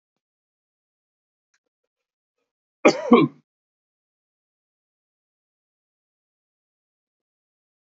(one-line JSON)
{"cough_length": "7.9 s", "cough_amplitude": 27471, "cough_signal_mean_std_ratio": 0.14, "survey_phase": "beta (2021-08-13 to 2022-03-07)", "age": "45-64", "gender": "Male", "wearing_mask": "No", "symptom_none": true, "smoker_status": "Ex-smoker", "respiratory_condition_asthma": false, "respiratory_condition_other": false, "recruitment_source": "REACT", "submission_delay": "2 days", "covid_test_result": "Negative", "covid_test_method": "RT-qPCR"}